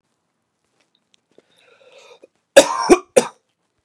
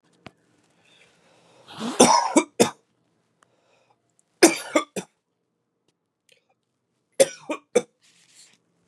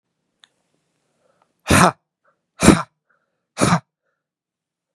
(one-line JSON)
{"cough_length": "3.8 s", "cough_amplitude": 32768, "cough_signal_mean_std_ratio": 0.22, "three_cough_length": "8.9 s", "three_cough_amplitude": 31077, "three_cough_signal_mean_std_ratio": 0.24, "exhalation_length": "4.9 s", "exhalation_amplitude": 32768, "exhalation_signal_mean_std_ratio": 0.26, "survey_phase": "beta (2021-08-13 to 2022-03-07)", "age": "18-44", "gender": "Male", "wearing_mask": "No", "symptom_cough_any": true, "symptom_new_continuous_cough": true, "symptom_runny_or_blocked_nose": true, "symptom_fatigue": true, "symptom_headache": true, "symptom_change_to_sense_of_smell_or_taste": true, "symptom_onset": "3 days", "smoker_status": "Never smoked", "respiratory_condition_asthma": false, "respiratory_condition_other": false, "recruitment_source": "Test and Trace", "submission_delay": "1 day", "covid_test_result": "Positive", "covid_test_method": "RT-qPCR"}